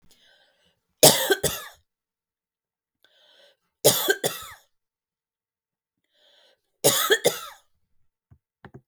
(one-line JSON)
{"three_cough_length": "8.9 s", "three_cough_amplitude": 32768, "three_cough_signal_mean_std_ratio": 0.27, "survey_phase": "beta (2021-08-13 to 2022-03-07)", "age": "45-64", "gender": "Female", "wearing_mask": "No", "symptom_none": true, "smoker_status": "Never smoked", "respiratory_condition_asthma": false, "respiratory_condition_other": false, "recruitment_source": "REACT", "submission_delay": "1 day", "covid_test_result": "Negative", "covid_test_method": "RT-qPCR"}